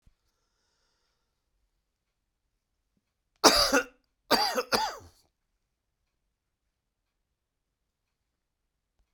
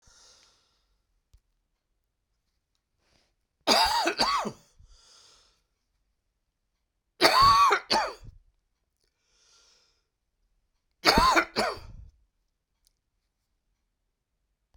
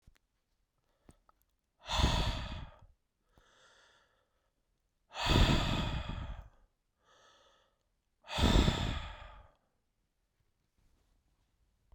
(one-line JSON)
{"cough_length": "9.1 s", "cough_amplitude": 29470, "cough_signal_mean_std_ratio": 0.22, "three_cough_length": "14.8 s", "three_cough_amplitude": 22726, "three_cough_signal_mean_std_ratio": 0.3, "exhalation_length": "11.9 s", "exhalation_amplitude": 7616, "exhalation_signal_mean_std_ratio": 0.35, "survey_phase": "beta (2021-08-13 to 2022-03-07)", "age": "65+", "gender": "Male", "wearing_mask": "No", "symptom_cough_any": true, "symptom_runny_or_blocked_nose": true, "symptom_fatigue": true, "symptom_fever_high_temperature": true, "symptom_headache": true, "symptom_other": true, "symptom_onset": "3 days", "smoker_status": "Never smoked", "respiratory_condition_asthma": false, "respiratory_condition_other": false, "recruitment_source": "Test and Trace", "submission_delay": "1 day", "covid_test_result": "Positive", "covid_test_method": "RT-qPCR", "covid_ct_value": 17.0, "covid_ct_gene": "ORF1ab gene", "covid_ct_mean": 17.7, "covid_viral_load": "1500000 copies/ml", "covid_viral_load_category": "High viral load (>1M copies/ml)"}